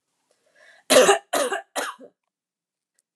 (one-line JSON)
{"three_cough_length": "3.2 s", "three_cough_amplitude": 25865, "three_cough_signal_mean_std_ratio": 0.33, "survey_phase": "alpha (2021-03-01 to 2021-08-12)", "age": "45-64", "gender": "Female", "wearing_mask": "No", "symptom_none": true, "smoker_status": "Never smoked", "respiratory_condition_asthma": false, "respiratory_condition_other": false, "recruitment_source": "REACT", "submission_delay": "2 days", "covid_test_result": "Negative", "covid_test_method": "RT-qPCR"}